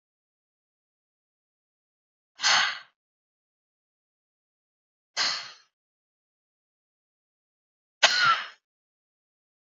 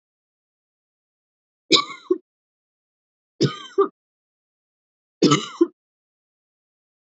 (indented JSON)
{
  "exhalation_length": "9.6 s",
  "exhalation_amplitude": 20457,
  "exhalation_signal_mean_std_ratio": 0.24,
  "three_cough_length": "7.2 s",
  "three_cough_amplitude": 29068,
  "three_cough_signal_mean_std_ratio": 0.23,
  "survey_phase": "beta (2021-08-13 to 2022-03-07)",
  "age": "18-44",
  "gender": "Female",
  "wearing_mask": "No",
  "symptom_none": true,
  "smoker_status": "Never smoked",
  "respiratory_condition_asthma": false,
  "respiratory_condition_other": false,
  "recruitment_source": "REACT",
  "submission_delay": "1 day",
  "covid_test_result": "Negative",
  "covid_test_method": "RT-qPCR",
  "influenza_a_test_result": "Negative",
  "influenza_b_test_result": "Negative"
}